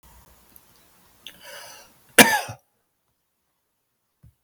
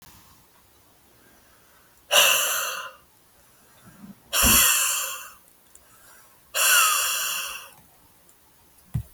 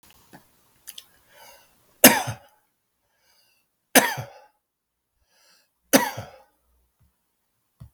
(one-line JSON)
{"cough_length": "4.4 s", "cough_amplitude": 32768, "cough_signal_mean_std_ratio": 0.18, "exhalation_length": "9.1 s", "exhalation_amplitude": 22665, "exhalation_signal_mean_std_ratio": 0.44, "three_cough_length": "7.9 s", "three_cough_amplitude": 32768, "three_cough_signal_mean_std_ratio": 0.19, "survey_phase": "beta (2021-08-13 to 2022-03-07)", "age": "45-64", "gender": "Male", "wearing_mask": "No", "symptom_none": true, "smoker_status": "Ex-smoker", "respiratory_condition_asthma": true, "respiratory_condition_other": true, "recruitment_source": "REACT", "submission_delay": "1 day", "covid_test_result": "Negative", "covid_test_method": "RT-qPCR"}